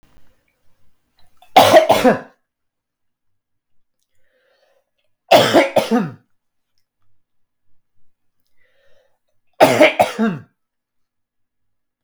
three_cough_length: 12.0 s
three_cough_amplitude: 32766
three_cough_signal_mean_std_ratio: 0.3
survey_phase: beta (2021-08-13 to 2022-03-07)
age: 45-64
gender: Male
wearing_mask: 'No'
symptom_cough_any: true
symptom_runny_or_blocked_nose: true
symptom_fatigue: true
symptom_headache: true
symptom_onset: 2 days
smoker_status: Never smoked
respiratory_condition_asthma: false
respiratory_condition_other: false
recruitment_source: Test and Trace
submission_delay: 2 days
covid_test_result: Positive
covid_test_method: RT-qPCR
covid_ct_value: 17.4
covid_ct_gene: ORF1ab gene
covid_ct_mean: 18.1
covid_viral_load: 1100000 copies/ml
covid_viral_load_category: High viral load (>1M copies/ml)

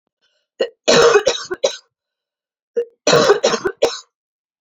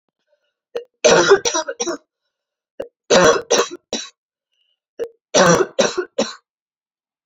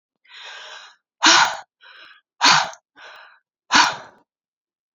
cough_length: 4.6 s
cough_amplitude: 32300
cough_signal_mean_std_ratio: 0.44
three_cough_length: 7.3 s
three_cough_amplitude: 32767
three_cough_signal_mean_std_ratio: 0.4
exhalation_length: 4.9 s
exhalation_amplitude: 30501
exhalation_signal_mean_std_ratio: 0.34
survey_phase: alpha (2021-03-01 to 2021-08-12)
age: 18-44
gender: Female
wearing_mask: 'No'
symptom_new_continuous_cough: true
symptom_headache: true
symptom_loss_of_taste: true
symptom_onset: 3 days
smoker_status: Never smoked
respiratory_condition_asthma: false
respiratory_condition_other: false
recruitment_source: Test and Trace
submission_delay: 2 days
covid_test_result: Positive
covid_test_method: RT-qPCR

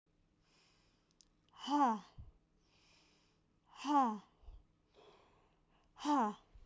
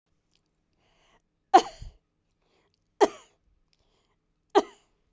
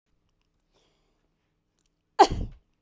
exhalation_length: 6.7 s
exhalation_amplitude: 2696
exhalation_signal_mean_std_ratio: 0.35
three_cough_length: 5.1 s
three_cough_amplitude: 20213
three_cough_signal_mean_std_ratio: 0.16
cough_length: 2.8 s
cough_amplitude: 21950
cough_signal_mean_std_ratio: 0.17
survey_phase: beta (2021-08-13 to 2022-03-07)
age: 18-44
gender: Female
wearing_mask: 'No'
symptom_runny_or_blocked_nose: true
smoker_status: Never smoked
respiratory_condition_asthma: false
respiratory_condition_other: true
recruitment_source: Test and Trace
submission_delay: 1 day
covid_test_result: Negative
covid_test_method: RT-qPCR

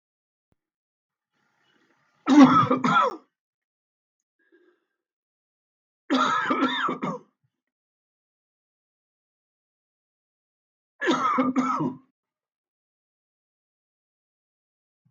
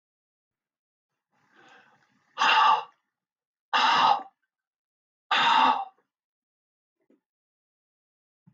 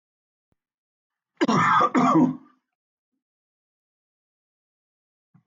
three_cough_length: 15.1 s
three_cough_amplitude: 28753
three_cough_signal_mean_std_ratio: 0.3
exhalation_length: 8.5 s
exhalation_amplitude: 11793
exhalation_signal_mean_std_ratio: 0.34
cough_length: 5.5 s
cough_amplitude: 13336
cough_signal_mean_std_ratio: 0.34
survey_phase: beta (2021-08-13 to 2022-03-07)
age: 65+
gender: Male
wearing_mask: 'No'
symptom_cough_any: true
symptom_runny_or_blocked_nose: true
symptom_diarrhoea: true
symptom_fatigue: true
symptom_onset: 5 days
smoker_status: Never smoked
respiratory_condition_asthma: false
respiratory_condition_other: false
recruitment_source: Test and Trace
submission_delay: 1 day
covid_test_result: Positive
covid_test_method: RT-qPCR
covid_ct_value: 12.5
covid_ct_gene: ORF1ab gene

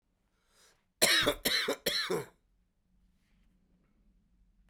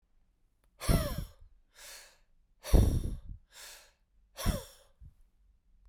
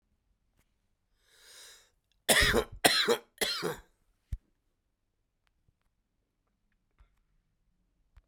cough_length: 4.7 s
cough_amplitude: 9910
cough_signal_mean_std_ratio: 0.36
exhalation_length: 5.9 s
exhalation_amplitude: 8911
exhalation_signal_mean_std_ratio: 0.32
three_cough_length: 8.3 s
three_cough_amplitude: 19135
three_cough_signal_mean_std_ratio: 0.27
survey_phase: beta (2021-08-13 to 2022-03-07)
age: 65+
gender: Male
wearing_mask: 'No'
symptom_cough_any: true
symptom_new_continuous_cough: true
symptom_runny_or_blocked_nose: true
symptom_fatigue: true
symptom_headache: true
smoker_status: Never smoked
respiratory_condition_asthma: false
respiratory_condition_other: false
recruitment_source: Test and Trace
submission_delay: 2 days
covid_test_result: Positive
covid_test_method: LFT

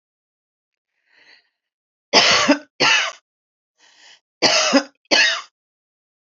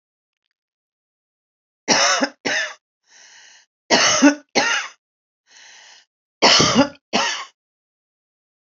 cough_length: 6.2 s
cough_amplitude: 32768
cough_signal_mean_std_ratio: 0.38
three_cough_length: 8.7 s
three_cough_amplitude: 32768
three_cough_signal_mean_std_ratio: 0.38
survey_phase: alpha (2021-03-01 to 2021-08-12)
age: 45-64
gender: Female
wearing_mask: 'No'
symptom_cough_any: true
symptom_diarrhoea: true
smoker_status: Ex-smoker
respiratory_condition_asthma: false
respiratory_condition_other: false
recruitment_source: Test and Trace
submission_delay: 3 days
covid_test_result: Positive
covid_test_method: RT-qPCR
covid_ct_value: 36.8
covid_ct_gene: ORF1ab gene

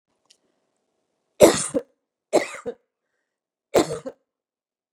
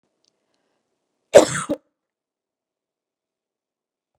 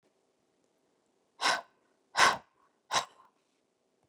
three_cough_length: 4.9 s
three_cough_amplitude: 32602
three_cough_signal_mean_std_ratio: 0.24
cough_length: 4.2 s
cough_amplitude: 32768
cough_signal_mean_std_ratio: 0.15
exhalation_length: 4.1 s
exhalation_amplitude: 11712
exhalation_signal_mean_std_ratio: 0.25
survey_phase: beta (2021-08-13 to 2022-03-07)
age: 45-64
gender: Female
wearing_mask: 'No'
symptom_none: true
smoker_status: Never smoked
respiratory_condition_asthma: false
respiratory_condition_other: false
recruitment_source: REACT
submission_delay: 1 day
covid_test_result: Negative
covid_test_method: RT-qPCR
influenza_a_test_result: Negative
influenza_b_test_result: Negative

